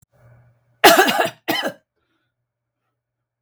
{"cough_length": "3.4 s", "cough_amplitude": 32768, "cough_signal_mean_std_ratio": 0.31, "survey_phase": "beta (2021-08-13 to 2022-03-07)", "age": "45-64", "gender": "Female", "wearing_mask": "No", "symptom_abdominal_pain": true, "symptom_diarrhoea": true, "symptom_onset": "18 days", "smoker_status": "Ex-smoker", "respiratory_condition_asthma": false, "respiratory_condition_other": false, "recruitment_source": "Test and Trace", "submission_delay": "1 day", "covid_test_result": "Negative", "covid_test_method": "RT-qPCR"}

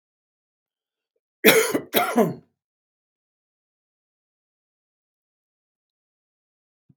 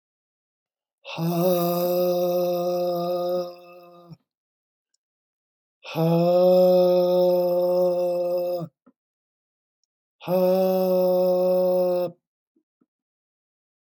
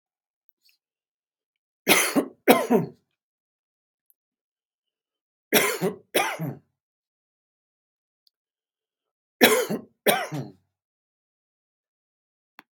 {"cough_length": "7.0 s", "cough_amplitude": 32767, "cough_signal_mean_std_ratio": 0.23, "exhalation_length": "13.9 s", "exhalation_amplitude": 11553, "exhalation_signal_mean_std_ratio": 0.7, "three_cough_length": "12.7 s", "three_cough_amplitude": 32587, "three_cough_signal_mean_std_ratio": 0.28, "survey_phase": "beta (2021-08-13 to 2022-03-07)", "age": "65+", "gender": "Male", "wearing_mask": "No", "symptom_none": true, "smoker_status": "Never smoked", "respiratory_condition_asthma": false, "respiratory_condition_other": false, "recruitment_source": "REACT", "submission_delay": "1 day", "covid_test_result": "Negative", "covid_test_method": "RT-qPCR"}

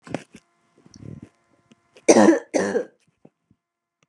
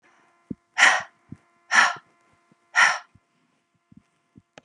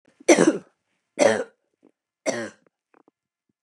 {"cough_length": "4.1 s", "cough_amplitude": 32256, "cough_signal_mean_std_ratio": 0.28, "exhalation_length": "4.6 s", "exhalation_amplitude": 25240, "exhalation_signal_mean_std_ratio": 0.3, "three_cough_length": "3.6 s", "three_cough_amplitude": 28749, "three_cough_signal_mean_std_ratio": 0.3, "survey_phase": "beta (2021-08-13 to 2022-03-07)", "age": "45-64", "gender": "Female", "wearing_mask": "No", "symptom_none": true, "symptom_onset": "12 days", "smoker_status": "Never smoked", "respiratory_condition_asthma": true, "respiratory_condition_other": false, "recruitment_source": "REACT", "submission_delay": "3 days", "covid_test_result": "Negative", "covid_test_method": "RT-qPCR", "influenza_a_test_result": "Negative", "influenza_b_test_result": "Negative"}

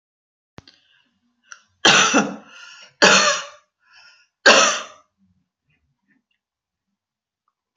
{"three_cough_length": "7.8 s", "three_cough_amplitude": 32375, "three_cough_signal_mean_std_ratio": 0.31, "survey_phase": "beta (2021-08-13 to 2022-03-07)", "age": "65+", "gender": "Female", "wearing_mask": "No", "symptom_none": true, "smoker_status": "Never smoked", "respiratory_condition_asthma": false, "respiratory_condition_other": false, "recruitment_source": "REACT", "submission_delay": "1 day", "covid_test_result": "Negative", "covid_test_method": "RT-qPCR", "influenza_a_test_result": "Negative", "influenza_b_test_result": "Negative"}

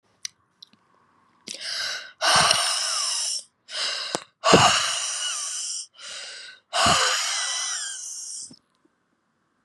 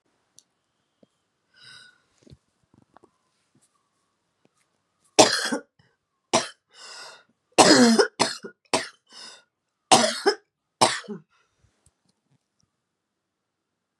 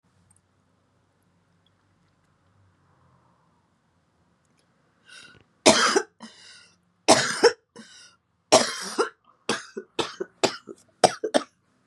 {"exhalation_length": "9.6 s", "exhalation_amplitude": 31173, "exhalation_signal_mean_std_ratio": 0.56, "three_cough_length": "14.0 s", "three_cough_amplitude": 32673, "three_cough_signal_mean_std_ratio": 0.25, "cough_length": "11.9 s", "cough_amplitude": 32766, "cough_signal_mean_std_ratio": 0.26, "survey_phase": "beta (2021-08-13 to 2022-03-07)", "age": "45-64", "gender": "Female", "wearing_mask": "No", "symptom_cough_any": true, "symptom_runny_or_blocked_nose": true, "symptom_sore_throat": true, "symptom_fatigue": true, "symptom_headache": true, "symptom_change_to_sense_of_smell_or_taste": true, "symptom_onset": "3 days", "smoker_status": "Ex-smoker", "respiratory_condition_asthma": false, "respiratory_condition_other": false, "recruitment_source": "Test and Trace", "submission_delay": "2 days", "covid_test_result": "Positive", "covid_test_method": "RT-qPCR", "covid_ct_value": 18.8, "covid_ct_gene": "ORF1ab gene"}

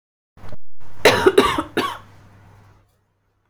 {"cough_length": "3.5 s", "cough_amplitude": 32768, "cough_signal_mean_std_ratio": 0.54, "survey_phase": "beta (2021-08-13 to 2022-03-07)", "age": "45-64", "gender": "Female", "wearing_mask": "No", "symptom_runny_or_blocked_nose": true, "symptom_abdominal_pain": true, "smoker_status": "Never smoked", "respiratory_condition_asthma": false, "respiratory_condition_other": false, "recruitment_source": "Test and Trace", "submission_delay": "2 days", "covid_test_result": "Negative", "covid_test_method": "RT-qPCR"}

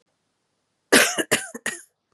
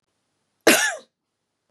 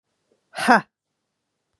{"three_cough_length": "2.1 s", "three_cough_amplitude": 32095, "three_cough_signal_mean_std_ratio": 0.33, "cough_length": "1.7 s", "cough_amplitude": 29888, "cough_signal_mean_std_ratio": 0.29, "exhalation_length": "1.8 s", "exhalation_amplitude": 31849, "exhalation_signal_mean_std_ratio": 0.23, "survey_phase": "beta (2021-08-13 to 2022-03-07)", "age": "18-44", "gender": "Female", "wearing_mask": "No", "symptom_none": true, "smoker_status": "Never smoked", "respiratory_condition_asthma": false, "respiratory_condition_other": false, "recruitment_source": "REACT", "submission_delay": "2 days", "covid_test_result": "Negative", "covid_test_method": "RT-qPCR", "influenza_a_test_result": "Negative", "influenza_b_test_result": "Negative"}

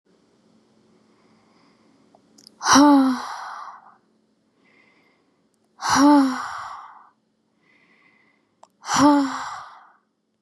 {"exhalation_length": "10.4 s", "exhalation_amplitude": 26825, "exhalation_signal_mean_std_ratio": 0.35, "survey_phase": "beta (2021-08-13 to 2022-03-07)", "age": "18-44", "gender": "Female", "wearing_mask": "No", "symptom_none": true, "smoker_status": "Never smoked", "respiratory_condition_asthma": false, "respiratory_condition_other": false, "recruitment_source": "REACT", "submission_delay": "3 days", "covid_test_result": "Negative", "covid_test_method": "RT-qPCR", "influenza_a_test_result": "Negative", "influenza_b_test_result": "Negative"}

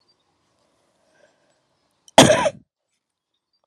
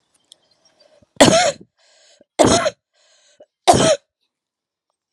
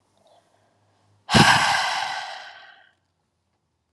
{"cough_length": "3.7 s", "cough_amplitude": 32768, "cough_signal_mean_std_ratio": 0.21, "three_cough_length": "5.1 s", "three_cough_amplitude": 32768, "three_cough_signal_mean_std_ratio": 0.33, "exhalation_length": "3.9 s", "exhalation_amplitude": 29771, "exhalation_signal_mean_std_ratio": 0.37, "survey_phase": "beta (2021-08-13 to 2022-03-07)", "age": "18-44", "gender": "Female", "wearing_mask": "No", "symptom_cough_any": true, "symptom_runny_or_blocked_nose": true, "symptom_diarrhoea": true, "symptom_fatigue": true, "symptom_headache": true, "symptom_change_to_sense_of_smell_or_taste": true, "symptom_onset": "2 days", "smoker_status": "Current smoker (1 to 10 cigarettes per day)", "respiratory_condition_asthma": false, "respiratory_condition_other": false, "recruitment_source": "Test and Trace", "submission_delay": "2 days", "covid_test_result": "Positive", "covid_test_method": "RT-qPCR", "covid_ct_value": 18.1, "covid_ct_gene": "ORF1ab gene", "covid_ct_mean": 18.5, "covid_viral_load": "880000 copies/ml", "covid_viral_load_category": "Low viral load (10K-1M copies/ml)"}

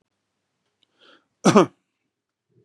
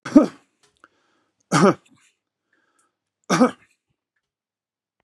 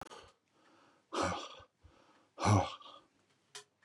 {"cough_length": "2.6 s", "cough_amplitude": 32423, "cough_signal_mean_std_ratio": 0.2, "three_cough_length": "5.0 s", "three_cough_amplitude": 32767, "three_cough_signal_mean_std_ratio": 0.24, "exhalation_length": "3.8 s", "exhalation_amplitude": 4950, "exhalation_signal_mean_std_ratio": 0.33, "survey_phase": "beta (2021-08-13 to 2022-03-07)", "age": "45-64", "gender": "Male", "wearing_mask": "No", "symptom_runny_or_blocked_nose": true, "smoker_status": "Current smoker (11 or more cigarettes per day)", "respiratory_condition_asthma": false, "respiratory_condition_other": false, "recruitment_source": "REACT", "submission_delay": "2 days", "covid_test_result": "Negative", "covid_test_method": "RT-qPCR", "influenza_a_test_result": "Negative", "influenza_b_test_result": "Negative"}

